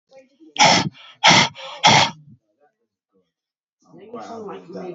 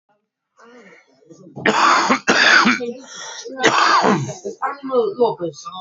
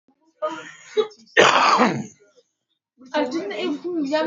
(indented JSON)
{
  "exhalation_length": "4.9 s",
  "exhalation_amplitude": 31810,
  "exhalation_signal_mean_std_ratio": 0.37,
  "three_cough_length": "5.8 s",
  "three_cough_amplitude": 30101,
  "three_cough_signal_mean_std_ratio": 0.6,
  "cough_length": "4.3 s",
  "cough_amplitude": 30770,
  "cough_signal_mean_std_ratio": 0.54,
  "survey_phase": "beta (2021-08-13 to 2022-03-07)",
  "age": "45-64",
  "gender": "Male",
  "wearing_mask": "No",
  "symptom_cough_any": true,
  "symptom_shortness_of_breath": true,
  "smoker_status": "Current smoker (1 to 10 cigarettes per day)",
  "respiratory_condition_asthma": false,
  "respiratory_condition_other": false,
  "recruitment_source": "REACT",
  "submission_delay": "2 days",
  "covid_test_result": "Negative",
  "covid_test_method": "RT-qPCR",
  "influenza_a_test_result": "Negative",
  "influenza_b_test_result": "Negative"
}